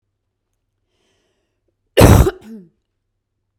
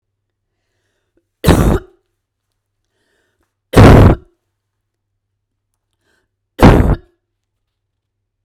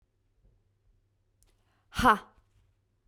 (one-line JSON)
{"cough_length": "3.6 s", "cough_amplitude": 32768, "cough_signal_mean_std_ratio": 0.24, "three_cough_length": "8.4 s", "three_cough_amplitude": 32768, "three_cough_signal_mean_std_ratio": 0.29, "exhalation_length": "3.1 s", "exhalation_amplitude": 11315, "exhalation_signal_mean_std_ratio": 0.19, "survey_phase": "beta (2021-08-13 to 2022-03-07)", "age": "18-44", "gender": "Female", "wearing_mask": "No", "symptom_none": true, "smoker_status": "Ex-smoker", "respiratory_condition_asthma": false, "respiratory_condition_other": false, "recruitment_source": "REACT", "submission_delay": "2 days", "covid_test_result": "Negative", "covid_test_method": "RT-qPCR", "influenza_a_test_result": "Negative", "influenza_b_test_result": "Negative"}